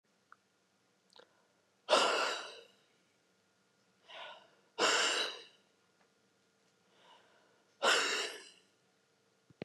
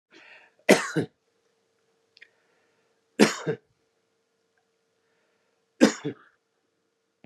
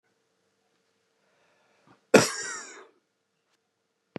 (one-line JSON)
{"exhalation_length": "9.6 s", "exhalation_amplitude": 5349, "exhalation_signal_mean_std_ratio": 0.34, "three_cough_length": "7.3 s", "three_cough_amplitude": 28689, "three_cough_signal_mean_std_ratio": 0.21, "cough_length": "4.2 s", "cough_amplitude": 29639, "cough_signal_mean_std_ratio": 0.18, "survey_phase": "beta (2021-08-13 to 2022-03-07)", "age": "45-64", "gender": "Male", "wearing_mask": "No", "symptom_none": true, "smoker_status": "Ex-smoker", "respiratory_condition_asthma": false, "respiratory_condition_other": false, "recruitment_source": "REACT", "submission_delay": "2 days", "covid_test_result": "Negative", "covid_test_method": "RT-qPCR", "influenza_a_test_result": "Negative", "influenza_b_test_result": "Negative"}